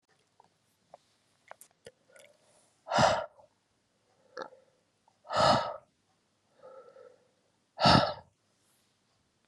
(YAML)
exhalation_length: 9.5 s
exhalation_amplitude: 13289
exhalation_signal_mean_std_ratio: 0.27
survey_phase: beta (2021-08-13 to 2022-03-07)
age: 45-64
gender: Female
wearing_mask: 'No'
symptom_cough_any: true
symptom_runny_or_blocked_nose: true
symptom_sore_throat: true
symptom_fatigue: true
symptom_headache: true
symptom_change_to_sense_of_smell_or_taste: true
symptom_loss_of_taste: true
symptom_onset: 4 days
smoker_status: Ex-smoker
respiratory_condition_asthma: false
respiratory_condition_other: false
recruitment_source: Test and Trace
submission_delay: 2 days
covid_test_result: Positive
covid_test_method: RT-qPCR
covid_ct_value: 20.8
covid_ct_gene: ORF1ab gene